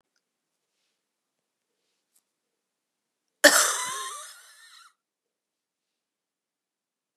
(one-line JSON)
{"cough_length": "7.2 s", "cough_amplitude": 29087, "cough_signal_mean_std_ratio": 0.19, "survey_phase": "beta (2021-08-13 to 2022-03-07)", "age": "45-64", "gender": "Female", "wearing_mask": "No", "symptom_cough_any": true, "symptom_new_continuous_cough": true, "symptom_runny_or_blocked_nose": true, "symptom_shortness_of_breath": true, "symptom_sore_throat": true, "symptom_abdominal_pain": true, "symptom_fatigue": true, "symptom_headache": true, "symptom_onset": "2 days", "smoker_status": "Never smoked", "respiratory_condition_asthma": false, "respiratory_condition_other": false, "recruitment_source": "Test and Trace", "submission_delay": "1 day", "covid_test_result": "Positive", "covid_test_method": "RT-qPCR", "covid_ct_value": 20.8, "covid_ct_gene": "ORF1ab gene"}